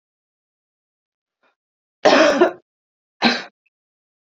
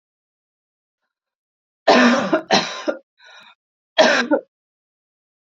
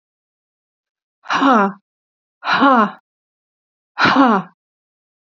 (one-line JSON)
{"cough_length": "4.3 s", "cough_amplitude": 32742, "cough_signal_mean_std_ratio": 0.3, "three_cough_length": "5.5 s", "three_cough_amplitude": 29811, "three_cough_signal_mean_std_ratio": 0.36, "exhalation_length": "5.4 s", "exhalation_amplitude": 28340, "exhalation_signal_mean_std_ratio": 0.4, "survey_phase": "beta (2021-08-13 to 2022-03-07)", "age": "45-64", "gender": "Female", "wearing_mask": "No", "symptom_cough_any": true, "symptom_runny_or_blocked_nose": true, "symptom_sore_throat": true, "symptom_fatigue": true, "symptom_headache": true, "symptom_onset": "3 days", "smoker_status": "Never smoked", "respiratory_condition_asthma": false, "respiratory_condition_other": false, "recruitment_source": "Test and Trace", "submission_delay": "2 days", "covid_test_result": "Positive", "covid_test_method": "RT-qPCR", "covid_ct_value": 30.5, "covid_ct_gene": "N gene"}